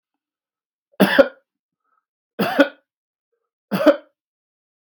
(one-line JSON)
{"three_cough_length": "4.8 s", "three_cough_amplitude": 32768, "three_cough_signal_mean_std_ratio": 0.27, "survey_phase": "beta (2021-08-13 to 2022-03-07)", "age": "45-64", "gender": "Male", "wearing_mask": "No", "symptom_none": true, "symptom_onset": "12 days", "smoker_status": "Current smoker (11 or more cigarettes per day)", "respiratory_condition_asthma": false, "respiratory_condition_other": false, "recruitment_source": "REACT", "submission_delay": "2 days", "covid_test_result": "Negative", "covid_test_method": "RT-qPCR", "influenza_a_test_result": "Negative", "influenza_b_test_result": "Negative"}